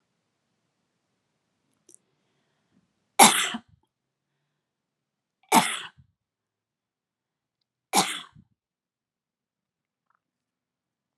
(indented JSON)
{
  "three_cough_length": "11.2 s",
  "three_cough_amplitude": 31259,
  "three_cough_signal_mean_std_ratio": 0.17,
  "survey_phase": "beta (2021-08-13 to 2022-03-07)",
  "age": "18-44",
  "gender": "Female",
  "wearing_mask": "No",
  "symptom_none": true,
  "smoker_status": "Never smoked",
  "respiratory_condition_asthma": false,
  "respiratory_condition_other": false,
  "recruitment_source": "REACT",
  "submission_delay": "2 days",
  "covid_test_result": "Negative",
  "covid_test_method": "RT-qPCR"
}